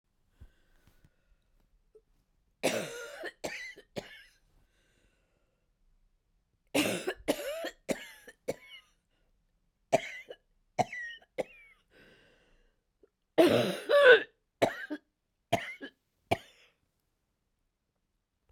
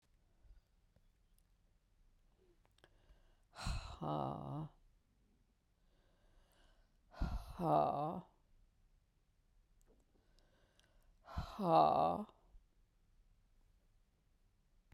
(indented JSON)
{
  "cough_length": "18.5 s",
  "cough_amplitude": 14924,
  "cough_signal_mean_std_ratio": 0.27,
  "exhalation_length": "14.9 s",
  "exhalation_amplitude": 3940,
  "exhalation_signal_mean_std_ratio": 0.32,
  "survey_phase": "beta (2021-08-13 to 2022-03-07)",
  "age": "65+",
  "gender": "Female",
  "wearing_mask": "No",
  "symptom_cough_any": true,
  "symptom_runny_or_blocked_nose": true,
  "symptom_fatigue": true,
  "symptom_fever_high_temperature": true,
  "symptom_headache": true,
  "smoker_status": "Never smoked",
  "respiratory_condition_asthma": false,
  "respiratory_condition_other": false,
  "recruitment_source": "Test and Trace",
  "submission_delay": "2 days",
  "covid_test_result": "Positive",
  "covid_test_method": "LFT"
}